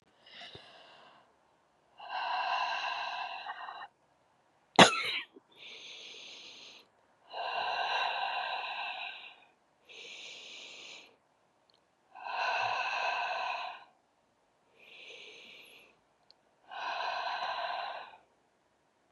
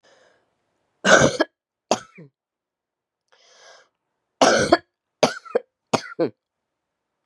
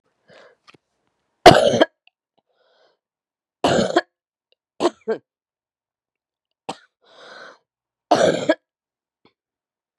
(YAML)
exhalation_length: 19.1 s
exhalation_amplitude: 23305
exhalation_signal_mean_std_ratio: 0.43
cough_length: 7.3 s
cough_amplitude: 32742
cough_signal_mean_std_ratio: 0.28
three_cough_length: 10.0 s
three_cough_amplitude: 32768
three_cough_signal_mean_std_ratio: 0.24
survey_phase: beta (2021-08-13 to 2022-03-07)
age: 45-64
gender: Female
wearing_mask: 'No'
symptom_cough_any: true
symptom_fatigue: true
symptom_headache: true
symptom_onset: 3 days
smoker_status: Never smoked
respiratory_condition_asthma: false
respiratory_condition_other: false
recruitment_source: Test and Trace
submission_delay: 2 days
covid_test_result: Positive
covid_test_method: RT-qPCR
covid_ct_value: 19.5
covid_ct_gene: ORF1ab gene